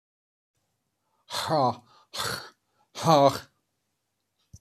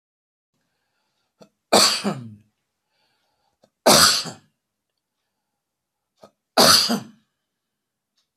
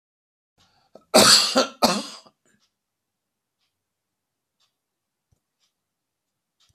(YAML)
exhalation_length: 4.6 s
exhalation_amplitude: 17706
exhalation_signal_mean_std_ratio: 0.33
three_cough_length: 8.4 s
three_cough_amplitude: 32767
three_cough_signal_mean_std_ratio: 0.29
cough_length: 6.7 s
cough_amplitude: 28606
cough_signal_mean_std_ratio: 0.24
survey_phase: beta (2021-08-13 to 2022-03-07)
age: 65+
gender: Male
wearing_mask: 'No'
symptom_none: true
symptom_onset: 12 days
smoker_status: Never smoked
respiratory_condition_asthma: false
respiratory_condition_other: false
recruitment_source: REACT
submission_delay: 2 days
covid_test_result: Negative
covid_test_method: RT-qPCR
influenza_a_test_result: Negative
influenza_b_test_result: Negative